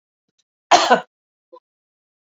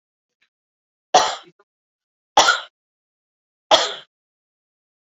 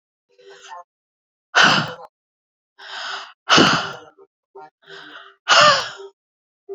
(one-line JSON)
{"cough_length": "2.3 s", "cough_amplitude": 27999, "cough_signal_mean_std_ratio": 0.25, "three_cough_length": "5.0 s", "three_cough_amplitude": 28947, "three_cough_signal_mean_std_ratio": 0.25, "exhalation_length": "6.7 s", "exhalation_amplitude": 32768, "exhalation_signal_mean_std_ratio": 0.35, "survey_phase": "beta (2021-08-13 to 2022-03-07)", "age": "45-64", "gender": "Female", "wearing_mask": "No", "symptom_none": true, "smoker_status": "Never smoked", "respiratory_condition_asthma": true, "respiratory_condition_other": false, "recruitment_source": "REACT", "submission_delay": "1 day", "covid_test_result": "Negative", "covid_test_method": "RT-qPCR"}